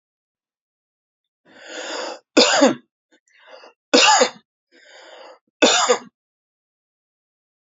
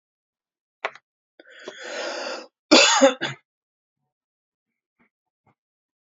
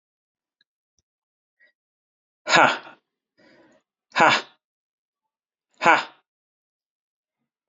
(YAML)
three_cough_length: 7.8 s
three_cough_amplitude: 29180
three_cough_signal_mean_std_ratio: 0.32
cough_length: 6.1 s
cough_amplitude: 32767
cough_signal_mean_std_ratio: 0.26
exhalation_length: 7.7 s
exhalation_amplitude: 28183
exhalation_signal_mean_std_ratio: 0.22
survey_phase: beta (2021-08-13 to 2022-03-07)
age: 18-44
gender: Male
wearing_mask: 'No'
symptom_headache: true
symptom_other: true
smoker_status: Never smoked
respiratory_condition_asthma: false
respiratory_condition_other: false
recruitment_source: Test and Trace
submission_delay: 1 day
covid_test_result: Positive
covid_test_method: RT-qPCR
covid_ct_value: 37.7
covid_ct_gene: N gene